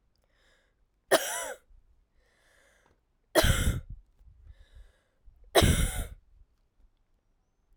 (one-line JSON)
{"three_cough_length": "7.8 s", "three_cough_amplitude": 17397, "three_cough_signal_mean_std_ratio": 0.31, "survey_phase": "alpha (2021-03-01 to 2021-08-12)", "age": "18-44", "gender": "Female", "wearing_mask": "No", "symptom_cough_any": true, "symptom_fatigue": true, "symptom_change_to_sense_of_smell_or_taste": true, "symptom_onset": "3 days", "smoker_status": "Never smoked", "respiratory_condition_asthma": false, "respiratory_condition_other": false, "recruitment_source": "Test and Trace", "submission_delay": "2 days", "covid_test_result": "Positive", "covid_test_method": "RT-qPCR", "covid_ct_value": 17.0, "covid_ct_gene": "S gene", "covid_ct_mean": 17.2, "covid_viral_load": "2300000 copies/ml", "covid_viral_load_category": "High viral load (>1M copies/ml)"}